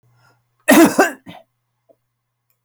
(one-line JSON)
{"cough_length": "2.6 s", "cough_amplitude": 31037, "cough_signal_mean_std_ratio": 0.31, "survey_phase": "alpha (2021-03-01 to 2021-08-12)", "age": "65+", "gender": "Male", "wearing_mask": "No", "symptom_none": true, "smoker_status": "Never smoked", "respiratory_condition_asthma": false, "respiratory_condition_other": false, "recruitment_source": "REACT", "submission_delay": "1 day", "covid_test_result": "Negative", "covid_test_method": "RT-qPCR"}